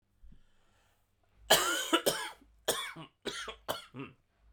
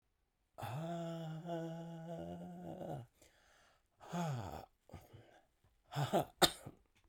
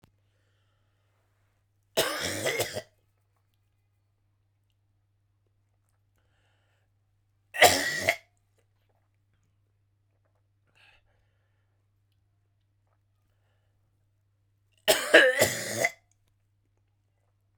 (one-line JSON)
{"cough_length": "4.5 s", "cough_amplitude": 11324, "cough_signal_mean_std_ratio": 0.39, "exhalation_length": "7.1 s", "exhalation_amplitude": 6966, "exhalation_signal_mean_std_ratio": 0.5, "three_cough_length": "17.6 s", "three_cough_amplitude": 22116, "three_cough_signal_mean_std_ratio": 0.23, "survey_phase": "beta (2021-08-13 to 2022-03-07)", "age": "45-64", "gender": "Male", "wearing_mask": "Yes", "symptom_cough_any": true, "symptom_fatigue": true, "symptom_fever_high_temperature": true, "symptom_change_to_sense_of_smell_or_taste": true, "symptom_onset": "6 days", "smoker_status": "Never smoked", "respiratory_condition_asthma": false, "respiratory_condition_other": false, "recruitment_source": "Test and Trace", "submission_delay": "2 days", "covid_test_result": "Positive", "covid_test_method": "RT-qPCR"}